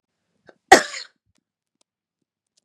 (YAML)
cough_length: 2.6 s
cough_amplitude: 32768
cough_signal_mean_std_ratio: 0.15
survey_phase: beta (2021-08-13 to 2022-03-07)
age: 18-44
gender: Female
wearing_mask: 'No'
symptom_none: true
smoker_status: Never smoked
respiratory_condition_asthma: false
respiratory_condition_other: false
recruitment_source: REACT
submission_delay: 2 days
covid_test_result: Negative
covid_test_method: RT-qPCR
influenza_a_test_result: Negative
influenza_b_test_result: Negative